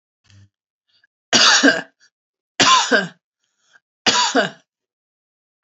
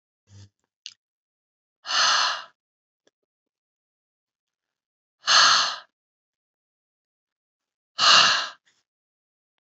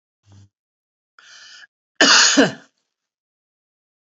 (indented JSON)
{
  "three_cough_length": "5.6 s",
  "three_cough_amplitude": 31215,
  "three_cough_signal_mean_std_ratio": 0.38,
  "exhalation_length": "9.7 s",
  "exhalation_amplitude": 23502,
  "exhalation_signal_mean_std_ratio": 0.3,
  "cough_length": "4.1 s",
  "cough_amplitude": 30135,
  "cough_signal_mean_std_ratio": 0.28,
  "survey_phase": "beta (2021-08-13 to 2022-03-07)",
  "age": "65+",
  "gender": "Female",
  "wearing_mask": "No",
  "symptom_none": true,
  "smoker_status": "Never smoked",
  "respiratory_condition_asthma": false,
  "respiratory_condition_other": false,
  "recruitment_source": "REACT",
  "submission_delay": "1 day",
  "covid_test_result": "Negative",
  "covid_test_method": "RT-qPCR"
}